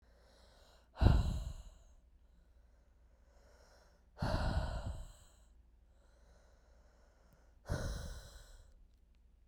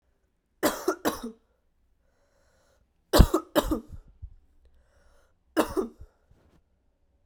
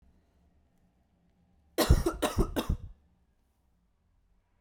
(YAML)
exhalation_length: 9.5 s
exhalation_amplitude: 8018
exhalation_signal_mean_std_ratio: 0.35
three_cough_length: 7.3 s
three_cough_amplitude: 26698
three_cough_signal_mean_std_ratio: 0.26
cough_length: 4.6 s
cough_amplitude: 12000
cough_signal_mean_std_ratio: 0.3
survey_phase: beta (2021-08-13 to 2022-03-07)
age: 18-44
gender: Female
wearing_mask: 'No'
symptom_cough_any: true
symptom_new_continuous_cough: true
symptom_runny_or_blocked_nose: true
symptom_fatigue: true
symptom_fever_high_temperature: true
symptom_headache: true
symptom_onset: 2 days
smoker_status: Ex-smoker
respiratory_condition_asthma: false
respiratory_condition_other: false
recruitment_source: Test and Trace
submission_delay: 1 day
covid_test_result: Positive
covid_test_method: RT-qPCR